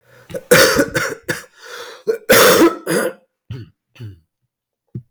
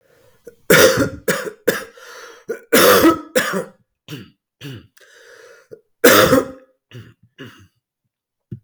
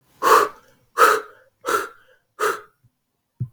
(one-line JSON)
{"cough_length": "5.1 s", "cough_amplitude": 32768, "cough_signal_mean_std_ratio": 0.46, "three_cough_length": "8.6 s", "three_cough_amplitude": 32767, "three_cough_signal_mean_std_ratio": 0.39, "exhalation_length": "3.5 s", "exhalation_amplitude": 32610, "exhalation_signal_mean_std_ratio": 0.39, "survey_phase": "beta (2021-08-13 to 2022-03-07)", "age": "45-64", "gender": "Male", "wearing_mask": "No", "symptom_cough_any": true, "symptom_runny_or_blocked_nose": true, "symptom_shortness_of_breath": true, "symptom_fatigue": true, "symptom_headache": true, "symptom_onset": "3 days", "smoker_status": "Ex-smoker", "respiratory_condition_asthma": false, "respiratory_condition_other": false, "recruitment_source": "Test and Trace", "submission_delay": "2 days", "covid_test_result": "Positive", "covid_test_method": "RT-qPCR", "covid_ct_value": 17.0, "covid_ct_gene": "N gene", "covid_ct_mean": 17.9, "covid_viral_load": "1300000 copies/ml", "covid_viral_load_category": "High viral load (>1M copies/ml)"}